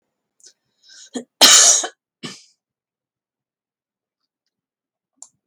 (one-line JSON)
{"cough_length": "5.5 s", "cough_amplitude": 32767, "cough_signal_mean_std_ratio": 0.24, "survey_phase": "beta (2021-08-13 to 2022-03-07)", "age": "65+", "gender": "Female", "wearing_mask": "No", "symptom_none": true, "smoker_status": "Never smoked", "respiratory_condition_asthma": false, "respiratory_condition_other": false, "recruitment_source": "REACT", "submission_delay": "0 days", "covid_test_result": "Negative", "covid_test_method": "RT-qPCR"}